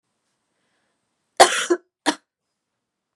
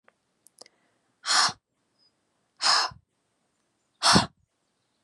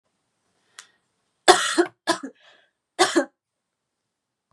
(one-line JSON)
{"cough_length": "3.2 s", "cough_amplitude": 32768, "cough_signal_mean_std_ratio": 0.22, "exhalation_length": "5.0 s", "exhalation_amplitude": 20957, "exhalation_signal_mean_std_ratio": 0.3, "three_cough_length": "4.5 s", "three_cough_amplitude": 32767, "three_cough_signal_mean_std_ratio": 0.26, "survey_phase": "beta (2021-08-13 to 2022-03-07)", "age": "18-44", "gender": "Female", "wearing_mask": "No", "symptom_cough_any": true, "symptom_runny_or_blocked_nose": true, "symptom_sore_throat": true, "symptom_fatigue": true, "symptom_headache": true, "symptom_onset": "3 days", "smoker_status": "Never smoked", "respiratory_condition_asthma": false, "respiratory_condition_other": false, "recruitment_source": "Test and Trace", "submission_delay": "1 day", "covid_test_result": "Positive", "covid_test_method": "RT-qPCR", "covid_ct_value": 21.3, "covid_ct_gene": "N gene"}